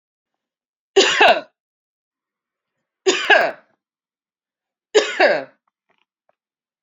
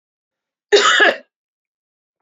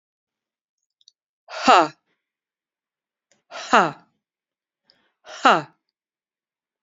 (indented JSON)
{
  "three_cough_length": "6.8 s",
  "three_cough_amplitude": 29089,
  "three_cough_signal_mean_std_ratio": 0.32,
  "cough_length": "2.2 s",
  "cough_amplitude": 30046,
  "cough_signal_mean_std_ratio": 0.36,
  "exhalation_length": "6.8 s",
  "exhalation_amplitude": 29565,
  "exhalation_signal_mean_std_ratio": 0.22,
  "survey_phase": "beta (2021-08-13 to 2022-03-07)",
  "age": "45-64",
  "gender": "Female",
  "wearing_mask": "No",
  "symptom_none": true,
  "smoker_status": "Ex-smoker",
  "respiratory_condition_asthma": false,
  "respiratory_condition_other": false,
  "recruitment_source": "REACT",
  "submission_delay": "3 days",
  "covid_test_result": "Negative",
  "covid_test_method": "RT-qPCR",
  "influenza_a_test_result": "Negative",
  "influenza_b_test_result": "Negative"
}